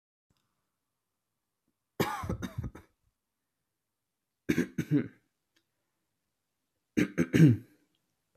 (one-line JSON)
{"three_cough_length": "8.4 s", "three_cough_amplitude": 11733, "three_cough_signal_mean_std_ratio": 0.26, "survey_phase": "beta (2021-08-13 to 2022-03-07)", "age": "18-44", "gender": "Male", "wearing_mask": "No", "symptom_none": true, "smoker_status": "Never smoked", "respiratory_condition_asthma": false, "respiratory_condition_other": false, "recruitment_source": "REACT", "submission_delay": "1 day", "covid_test_result": "Negative", "covid_test_method": "RT-qPCR"}